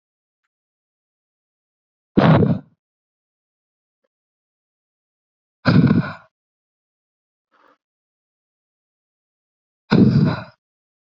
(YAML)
exhalation_length: 11.2 s
exhalation_amplitude: 27044
exhalation_signal_mean_std_ratio: 0.27
survey_phase: beta (2021-08-13 to 2022-03-07)
age: 18-44
gender: Female
wearing_mask: 'No'
symptom_none: true
smoker_status: Never smoked
respiratory_condition_asthma: false
respiratory_condition_other: false
recruitment_source: REACT
submission_delay: 1 day
covid_test_result: Negative
covid_test_method: RT-qPCR